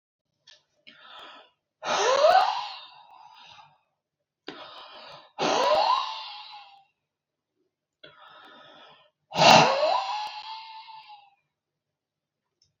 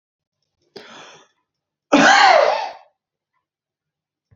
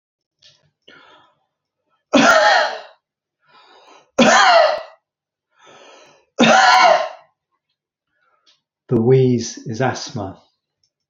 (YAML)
exhalation_length: 12.8 s
exhalation_amplitude: 25305
exhalation_signal_mean_std_ratio: 0.36
cough_length: 4.4 s
cough_amplitude: 28982
cough_signal_mean_std_ratio: 0.34
three_cough_length: 11.1 s
three_cough_amplitude: 32767
three_cough_signal_mean_std_ratio: 0.42
survey_phase: beta (2021-08-13 to 2022-03-07)
age: 65+
gender: Male
wearing_mask: 'No'
symptom_cough_any: true
symptom_onset: 12 days
smoker_status: Ex-smoker
respiratory_condition_asthma: true
respiratory_condition_other: false
recruitment_source: REACT
submission_delay: 1 day
covid_test_result: Negative
covid_test_method: RT-qPCR